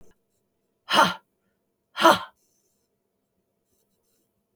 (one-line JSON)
{"exhalation_length": "4.6 s", "exhalation_amplitude": 27089, "exhalation_signal_mean_std_ratio": 0.22, "survey_phase": "beta (2021-08-13 to 2022-03-07)", "age": "65+", "gender": "Female", "wearing_mask": "No", "symptom_none": true, "smoker_status": "Ex-smoker", "respiratory_condition_asthma": false, "respiratory_condition_other": false, "recruitment_source": "REACT", "submission_delay": "1 day", "covid_test_result": "Negative", "covid_test_method": "RT-qPCR", "influenza_a_test_result": "Negative", "influenza_b_test_result": "Negative"}